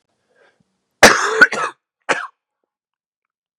{
  "cough_length": "3.6 s",
  "cough_amplitude": 32768,
  "cough_signal_mean_std_ratio": 0.28,
  "survey_phase": "beta (2021-08-13 to 2022-03-07)",
  "age": "18-44",
  "gender": "Male",
  "wearing_mask": "No",
  "symptom_cough_any": true,
  "symptom_new_continuous_cough": true,
  "symptom_runny_or_blocked_nose": true,
  "symptom_sore_throat": true,
  "symptom_fever_high_temperature": true,
  "symptom_onset": "5 days",
  "smoker_status": "Never smoked",
  "respiratory_condition_asthma": false,
  "respiratory_condition_other": false,
  "recruitment_source": "Test and Trace",
  "submission_delay": "3 days",
  "covid_test_result": "Positive",
  "covid_test_method": "RT-qPCR",
  "covid_ct_value": 18.3,
  "covid_ct_gene": "N gene"
}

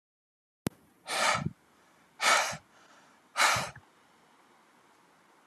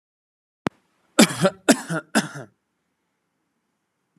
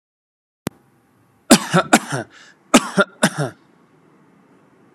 {
  "exhalation_length": "5.5 s",
  "exhalation_amplitude": 11611,
  "exhalation_signal_mean_std_ratio": 0.35,
  "three_cough_length": "4.2 s",
  "three_cough_amplitude": 32534,
  "three_cough_signal_mean_std_ratio": 0.25,
  "cough_length": "4.9 s",
  "cough_amplitude": 32768,
  "cough_signal_mean_std_ratio": 0.29,
  "survey_phase": "alpha (2021-03-01 to 2021-08-12)",
  "age": "18-44",
  "gender": "Male",
  "wearing_mask": "No",
  "symptom_none": true,
  "smoker_status": "Never smoked",
  "respiratory_condition_asthma": false,
  "respiratory_condition_other": false,
  "recruitment_source": "REACT",
  "submission_delay": "1 day",
  "covid_test_result": "Negative",
  "covid_test_method": "RT-qPCR"
}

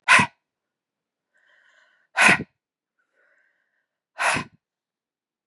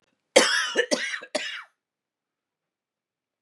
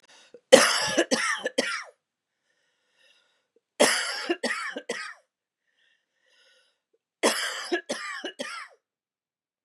{
  "exhalation_length": "5.5 s",
  "exhalation_amplitude": 27558,
  "exhalation_signal_mean_std_ratio": 0.25,
  "cough_length": "3.4 s",
  "cough_amplitude": 29448,
  "cough_signal_mean_std_ratio": 0.35,
  "three_cough_length": "9.6 s",
  "three_cough_amplitude": 32767,
  "three_cough_signal_mean_std_ratio": 0.35,
  "survey_phase": "beta (2021-08-13 to 2022-03-07)",
  "age": "45-64",
  "gender": "Female",
  "wearing_mask": "No",
  "symptom_none": true,
  "smoker_status": "Never smoked",
  "respiratory_condition_asthma": false,
  "respiratory_condition_other": false,
  "recruitment_source": "REACT",
  "submission_delay": "2 days",
  "covid_test_result": "Negative",
  "covid_test_method": "RT-qPCR",
  "influenza_a_test_result": "Negative",
  "influenza_b_test_result": "Negative"
}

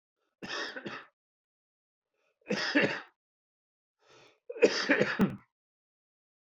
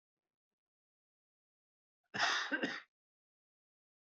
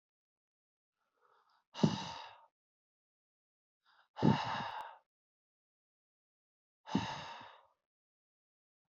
{
  "three_cough_length": "6.6 s",
  "three_cough_amplitude": 9992,
  "three_cough_signal_mean_std_ratio": 0.34,
  "cough_length": "4.2 s",
  "cough_amplitude": 3017,
  "cough_signal_mean_std_ratio": 0.29,
  "exhalation_length": "9.0 s",
  "exhalation_amplitude": 5529,
  "exhalation_signal_mean_std_ratio": 0.25,
  "survey_phase": "alpha (2021-03-01 to 2021-08-12)",
  "age": "45-64",
  "gender": "Male",
  "wearing_mask": "No",
  "symptom_cough_any": true,
  "symptom_fever_high_temperature": true,
  "symptom_headache": true,
  "smoker_status": "Never smoked",
  "respiratory_condition_asthma": true,
  "respiratory_condition_other": false,
  "recruitment_source": "Test and Trace",
  "submission_delay": "1 day",
  "covid_test_result": "Positive",
  "covid_test_method": "RT-qPCR",
  "covid_ct_value": 20.9,
  "covid_ct_gene": "ORF1ab gene",
  "covid_ct_mean": 21.1,
  "covid_viral_load": "120000 copies/ml",
  "covid_viral_load_category": "Low viral load (10K-1M copies/ml)"
}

